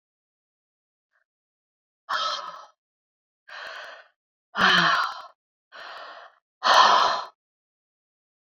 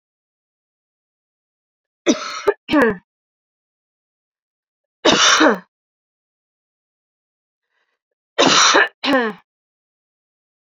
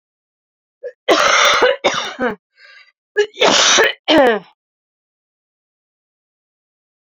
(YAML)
exhalation_length: 8.5 s
exhalation_amplitude: 19590
exhalation_signal_mean_std_ratio: 0.34
three_cough_length: 10.7 s
three_cough_amplitude: 30058
three_cough_signal_mean_std_ratio: 0.32
cough_length: 7.2 s
cough_amplitude: 32254
cough_signal_mean_std_ratio: 0.44
survey_phase: beta (2021-08-13 to 2022-03-07)
age: 45-64
gender: Female
wearing_mask: 'No'
symptom_cough_any: true
symptom_runny_or_blocked_nose: true
symptom_shortness_of_breath: true
symptom_sore_throat: true
symptom_fatigue: true
symptom_headache: true
symptom_change_to_sense_of_smell_or_taste: true
symptom_loss_of_taste: true
symptom_onset: 2 days
smoker_status: Ex-smoker
respiratory_condition_asthma: true
respiratory_condition_other: false
recruitment_source: Test and Trace
submission_delay: 1 day
covid_test_result: Positive
covid_test_method: RT-qPCR